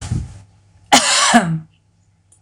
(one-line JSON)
{"cough_length": "2.4 s", "cough_amplitude": 26028, "cough_signal_mean_std_ratio": 0.48, "survey_phase": "beta (2021-08-13 to 2022-03-07)", "age": "45-64", "gender": "Female", "wearing_mask": "No", "symptom_none": true, "smoker_status": "Never smoked", "respiratory_condition_asthma": false, "respiratory_condition_other": false, "recruitment_source": "REACT", "submission_delay": "3 days", "covid_test_result": "Negative", "covid_test_method": "RT-qPCR", "influenza_a_test_result": "Negative", "influenza_b_test_result": "Negative"}